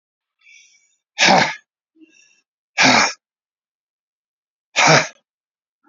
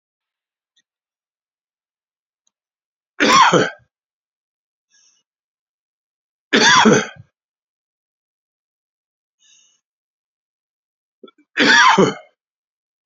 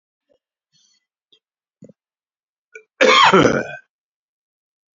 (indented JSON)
{
  "exhalation_length": "5.9 s",
  "exhalation_amplitude": 30085,
  "exhalation_signal_mean_std_ratio": 0.32,
  "three_cough_length": "13.1 s",
  "three_cough_amplitude": 31548,
  "three_cough_signal_mean_std_ratio": 0.28,
  "cough_length": "4.9 s",
  "cough_amplitude": 29154,
  "cough_signal_mean_std_ratio": 0.28,
  "survey_phase": "beta (2021-08-13 to 2022-03-07)",
  "age": "65+",
  "gender": "Male",
  "wearing_mask": "No",
  "symptom_none": true,
  "smoker_status": "Ex-smoker",
  "respiratory_condition_asthma": false,
  "respiratory_condition_other": false,
  "recruitment_source": "REACT",
  "submission_delay": "2 days",
  "covid_test_result": "Negative",
  "covid_test_method": "RT-qPCR"
}